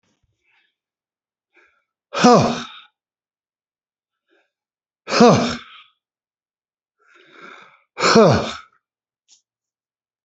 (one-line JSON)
{"exhalation_length": "10.2 s", "exhalation_amplitude": 31515, "exhalation_signal_mean_std_ratio": 0.29, "survey_phase": "beta (2021-08-13 to 2022-03-07)", "age": "65+", "gender": "Male", "wearing_mask": "No", "symptom_cough_any": true, "smoker_status": "Never smoked", "respiratory_condition_asthma": true, "respiratory_condition_other": false, "recruitment_source": "REACT", "submission_delay": "7 days", "covid_test_result": "Negative", "covid_test_method": "RT-qPCR", "influenza_a_test_result": "Negative", "influenza_b_test_result": "Negative"}